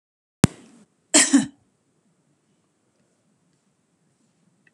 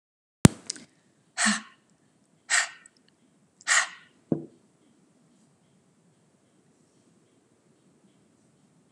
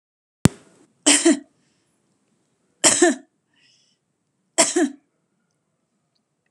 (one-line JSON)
{"cough_length": "4.7 s", "cough_amplitude": 32767, "cough_signal_mean_std_ratio": 0.19, "exhalation_length": "8.9 s", "exhalation_amplitude": 32767, "exhalation_signal_mean_std_ratio": 0.19, "three_cough_length": "6.5 s", "three_cough_amplitude": 32767, "three_cough_signal_mean_std_ratio": 0.28, "survey_phase": "beta (2021-08-13 to 2022-03-07)", "age": "65+", "gender": "Female", "wearing_mask": "No", "symptom_none": true, "smoker_status": "Never smoked", "respiratory_condition_asthma": false, "respiratory_condition_other": false, "recruitment_source": "REACT", "submission_delay": "4 days", "covid_test_result": "Negative", "covid_test_method": "RT-qPCR", "influenza_a_test_result": "Negative", "influenza_b_test_result": "Negative"}